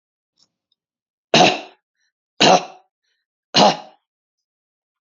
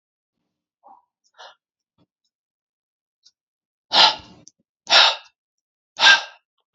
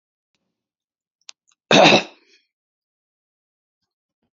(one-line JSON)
{"three_cough_length": "5.0 s", "three_cough_amplitude": 32768, "three_cough_signal_mean_std_ratio": 0.28, "exhalation_length": "6.7 s", "exhalation_amplitude": 32768, "exhalation_signal_mean_std_ratio": 0.24, "cough_length": "4.4 s", "cough_amplitude": 28218, "cough_signal_mean_std_ratio": 0.21, "survey_phase": "beta (2021-08-13 to 2022-03-07)", "age": "45-64", "gender": "Male", "wearing_mask": "No", "symptom_none": true, "smoker_status": "Never smoked", "respiratory_condition_asthma": false, "respiratory_condition_other": false, "recruitment_source": "REACT", "submission_delay": "2 days", "covid_test_result": "Negative", "covid_test_method": "RT-qPCR", "influenza_a_test_result": "Negative", "influenza_b_test_result": "Negative"}